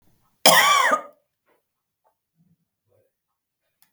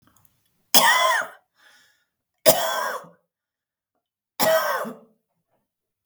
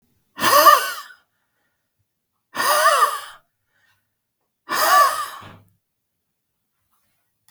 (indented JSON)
{
  "cough_length": "3.9 s",
  "cough_amplitude": 32768,
  "cough_signal_mean_std_ratio": 0.29,
  "three_cough_length": "6.1 s",
  "three_cough_amplitude": 32768,
  "three_cough_signal_mean_std_ratio": 0.37,
  "exhalation_length": "7.5 s",
  "exhalation_amplitude": 32768,
  "exhalation_signal_mean_std_ratio": 0.37,
  "survey_phase": "beta (2021-08-13 to 2022-03-07)",
  "age": "65+",
  "gender": "Female",
  "wearing_mask": "No",
  "symptom_cough_any": true,
  "smoker_status": "Never smoked",
  "respiratory_condition_asthma": false,
  "respiratory_condition_other": false,
  "recruitment_source": "REACT",
  "submission_delay": "3 days",
  "covid_test_result": "Negative",
  "covid_test_method": "RT-qPCR",
  "influenza_a_test_result": "Negative",
  "influenza_b_test_result": "Negative"
}